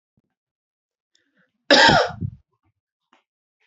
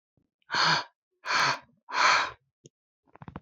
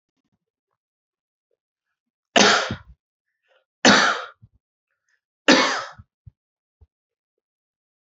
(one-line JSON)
{"cough_length": "3.7 s", "cough_amplitude": 29889, "cough_signal_mean_std_ratio": 0.27, "exhalation_length": "3.4 s", "exhalation_amplitude": 10658, "exhalation_signal_mean_std_ratio": 0.45, "three_cough_length": "8.2 s", "three_cough_amplitude": 29554, "three_cough_signal_mean_std_ratio": 0.27, "survey_phase": "beta (2021-08-13 to 2022-03-07)", "age": "18-44", "gender": "Male", "wearing_mask": "No", "symptom_none": true, "smoker_status": "Ex-smoker", "respiratory_condition_asthma": false, "respiratory_condition_other": false, "recruitment_source": "REACT", "submission_delay": "5 days", "covid_test_result": "Negative", "covid_test_method": "RT-qPCR", "influenza_a_test_result": "Negative", "influenza_b_test_result": "Negative"}